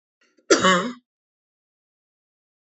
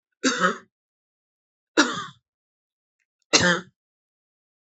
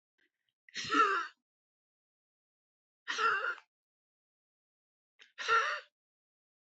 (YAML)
cough_length: 2.7 s
cough_amplitude: 24350
cough_signal_mean_std_ratio: 0.28
three_cough_length: 4.6 s
three_cough_amplitude: 30326
three_cough_signal_mean_std_ratio: 0.3
exhalation_length: 6.7 s
exhalation_amplitude: 4872
exhalation_signal_mean_std_ratio: 0.34
survey_phase: alpha (2021-03-01 to 2021-08-12)
age: 45-64
gender: Female
wearing_mask: 'No'
symptom_none: true
symptom_onset: 12 days
smoker_status: Never smoked
respiratory_condition_asthma: false
respiratory_condition_other: false
recruitment_source: REACT
submission_delay: 3 days
covid_test_result: Negative
covid_test_method: RT-qPCR